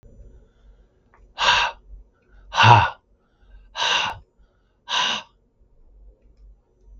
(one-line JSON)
{"exhalation_length": "7.0 s", "exhalation_amplitude": 32680, "exhalation_signal_mean_std_ratio": 0.33, "survey_phase": "beta (2021-08-13 to 2022-03-07)", "age": "65+", "gender": "Male", "wearing_mask": "No", "symptom_none": true, "symptom_onset": "12 days", "smoker_status": "Never smoked", "respiratory_condition_asthma": false, "respiratory_condition_other": false, "recruitment_source": "REACT", "submission_delay": "1 day", "covid_test_result": "Negative", "covid_test_method": "RT-qPCR", "influenza_a_test_result": "Negative", "influenza_b_test_result": "Negative"}